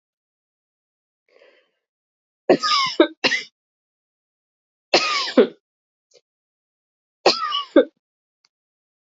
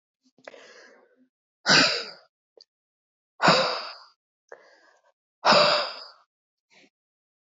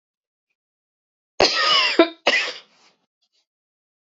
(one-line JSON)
{"three_cough_length": "9.1 s", "three_cough_amplitude": 27814, "three_cough_signal_mean_std_ratio": 0.29, "exhalation_length": "7.4 s", "exhalation_amplitude": 17611, "exhalation_signal_mean_std_ratio": 0.32, "cough_length": "4.1 s", "cough_amplitude": 28119, "cough_signal_mean_std_ratio": 0.35, "survey_phase": "beta (2021-08-13 to 2022-03-07)", "age": "45-64", "gender": "Female", "wearing_mask": "No", "symptom_runny_or_blocked_nose": true, "symptom_sore_throat": true, "symptom_abdominal_pain": true, "symptom_fatigue": true, "symptom_headache": true, "smoker_status": "Never smoked", "respiratory_condition_asthma": true, "respiratory_condition_other": false, "recruitment_source": "Test and Trace", "submission_delay": "1 day", "covid_test_result": "Positive", "covid_test_method": "RT-qPCR"}